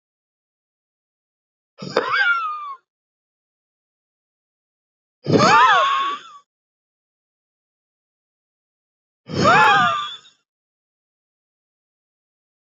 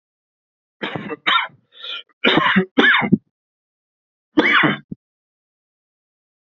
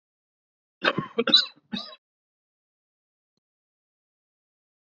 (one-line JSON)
{"exhalation_length": "12.7 s", "exhalation_amplitude": 27323, "exhalation_signal_mean_std_ratio": 0.34, "three_cough_length": "6.5 s", "three_cough_amplitude": 27857, "three_cough_signal_mean_std_ratio": 0.4, "cough_length": "4.9 s", "cough_amplitude": 19680, "cough_signal_mean_std_ratio": 0.21, "survey_phase": "beta (2021-08-13 to 2022-03-07)", "age": "45-64", "gender": "Male", "wearing_mask": "No", "symptom_cough_any": true, "symptom_runny_or_blocked_nose": true, "symptom_sore_throat": true, "symptom_fatigue": true, "symptom_headache": true, "symptom_change_to_sense_of_smell_or_taste": true, "symptom_loss_of_taste": true, "symptom_other": true, "symptom_onset": "2 days", "smoker_status": "Current smoker (e-cigarettes or vapes only)", "respiratory_condition_asthma": false, "respiratory_condition_other": false, "recruitment_source": "Test and Trace", "submission_delay": "2 days", "covid_test_result": "Positive", "covid_test_method": "RT-qPCR", "covid_ct_value": 14.9, "covid_ct_gene": "ORF1ab gene"}